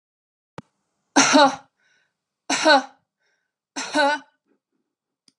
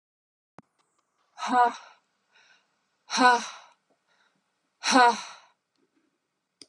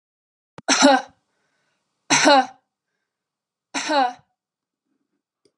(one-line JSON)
{"three_cough_length": "5.4 s", "three_cough_amplitude": 25862, "three_cough_signal_mean_std_ratio": 0.33, "exhalation_length": "6.7 s", "exhalation_amplitude": 17233, "exhalation_signal_mean_std_ratio": 0.29, "cough_length": "5.6 s", "cough_amplitude": 28080, "cough_signal_mean_std_ratio": 0.33, "survey_phase": "alpha (2021-03-01 to 2021-08-12)", "age": "45-64", "gender": "Female", "wearing_mask": "No", "symptom_none": true, "smoker_status": "Never smoked", "respiratory_condition_asthma": false, "respiratory_condition_other": false, "recruitment_source": "REACT", "submission_delay": "1 day", "covid_test_result": "Negative", "covid_test_method": "RT-qPCR"}